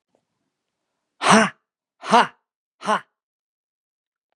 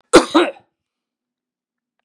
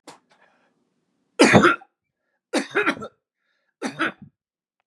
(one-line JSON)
{"exhalation_length": "4.4 s", "exhalation_amplitude": 32767, "exhalation_signal_mean_std_ratio": 0.26, "cough_length": "2.0 s", "cough_amplitude": 32768, "cough_signal_mean_std_ratio": 0.26, "three_cough_length": "4.9 s", "three_cough_amplitude": 31485, "three_cough_signal_mean_std_ratio": 0.3, "survey_phase": "beta (2021-08-13 to 2022-03-07)", "age": "45-64", "gender": "Male", "wearing_mask": "No", "symptom_none": true, "smoker_status": "Never smoked", "respiratory_condition_asthma": false, "respiratory_condition_other": false, "recruitment_source": "REACT", "submission_delay": "2 days", "covid_test_result": "Negative", "covid_test_method": "RT-qPCR", "influenza_a_test_result": "Negative", "influenza_b_test_result": "Negative"}